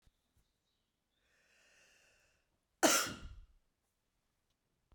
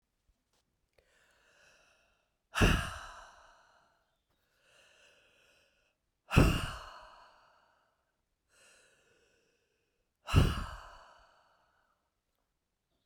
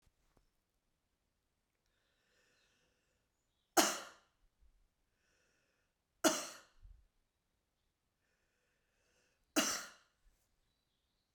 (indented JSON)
{
  "cough_length": "4.9 s",
  "cough_amplitude": 6425,
  "cough_signal_mean_std_ratio": 0.2,
  "exhalation_length": "13.1 s",
  "exhalation_amplitude": 12824,
  "exhalation_signal_mean_std_ratio": 0.23,
  "three_cough_length": "11.3 s",
  "three_cough_amplitude": 8038,
  "three_cough_signal_mean_std_ratio": 0.19,
  "survey_phase": "beta (2021-08-13 to 2022-03-07)",
  "age": "65+",
  "gender": "Female",
  "wearing_mask": "No",
  "symptom_cough_any": true,
  "symptom_runny_or_blocked_nose": true,
  "symptom_fatigue": true,
  "symptom_headache": true,
  "symptom_onset": "2 days",
  "smoker_status": "Never smoked",
  "respiratory_condition_asthma": false,
  "respiratory_condition_other": false,
  "recruitment_source": "Test and Trace",
  "submission_delay": "1 day",
  "covid_test_result": "Positive",
  "covid_test_method": "RT-qPCR",
  "covid_ct_value": 16.2,
  "covid_ct_gene": "ORF1ab gene",
  "covid_ct_mean": 16.6,
  "covid_viral_load": "3700000 copies/ml",
  "covid_viral_load_category": "High viral load (>1M copies/ml)"
}